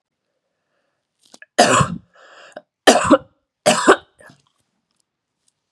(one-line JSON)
{"three_cough_length": "5.7 s", "three_cough_amplitude": 32768, "three_cough_signal_mean_std_ratio": 0.3, "survey_phase": "beta (2021-08-13 to 2022-03-07)", "age": "45-64", "gender": "Female", "wearing_mask": "No", "symptom_cough_any": true, "symptom_runny_or_blocked_nose": true, "symptom_shortness_of_breath": true, "symptom_sore_throat": true, "symptom_fatigue": true, "symptom_onset": "3 days", "smoker_status": "Never smoked", "respiratory_condition_asthma": false, "respiratory_condition_other": false, "recruitment_source": "Test and Trace", "submission_delay": "2 days", "covid_test_result": "Positive", "covid_test_method": "RT-qPCR", "covid_ct_value": 20.5, "covid_ct_gene": "ORF1ab gene", "covid_ct_mean": 20.9, "covid_viral_load": "140000 copies/ml", "covid_viral_load_category": "Low viral load (10K-1M copies/ml)"}